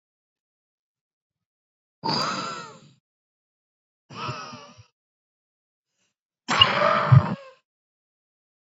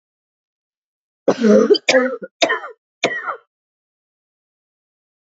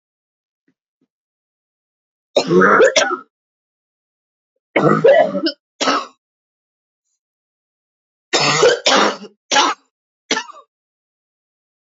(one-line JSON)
{"exhalation_length": "8.7 s", "exhalation_amplitude": 28497, "exhalation_signal_mean_std_ratio": 0.28, "cough_length": "5.3 s", "cough_amplitude": 29707, "cough_signal_mean_std_ratio": 0.35, "three_cough_length": "11.9 s", "three_cough_amplitude": 30209, "three_cough_signal_mean_std_ratio": 0.38, "survey_phase": "beta (2021-08-13 to 2022-03-07)", "age": "18-44", "gender": "Female", "wearing_mask": "No", "symptom_cough_any": true, "symptom_runny_or_blocked_nose": true, "symptom_sore_throat": true, "symptom_fatigue": true, "symptom_onset": "6 days", "smoker_status": "Ex-smoker", "respiratory_condition_asthma": false, "respiratory_condition_other": false, "recruitment_source": "Test and Trace", "submission_delay": "1 day", "covid_test_result": "Negative", "covid_test_method": "RT-qPCR"}